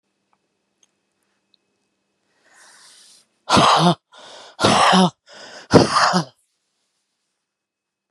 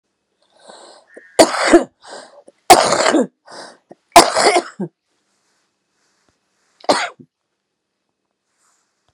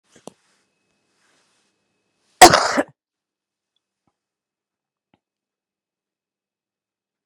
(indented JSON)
{
  "exhalation_length": "8.1 s",
  "exhalation_amplitude": 32768,
  "exhalation_signal_mean_std_ratio": 0.34,
  "three_cough_length": "9.1 s",
  "three_cough_amplitude": 32768,
  "three_cough_signal_mean_std_ratio": 0.3,
  "cough_length": "7.3 s",
  "cough_amplitude": 32768,
  "cough_signal_mean_std_ratio": 0.14,
  "survey_phase": "beta (2021-08-13 to 2022-03-07)",
  "age": "65+",
  "gender": "Female",
  "wearing_mask": "No",
  "symptom_cough_any": true,
  "symptom_runny_or_blocked_nose": true,
  "symptom_shortness_of_breath": true,
  "symptom_onset": "12 days",
  "smoker_status": "Current smoker (1 to 10 cigarettes per day)",
  "respiratory_condition_asthma": true,
  "respiratory_condition_other": false,
  "recruitment_source": "REACT",
  "submission_delay": "1 day",
  "covid_test_result": "Negative",
  "covid_test_method": "RT-qPCR"
}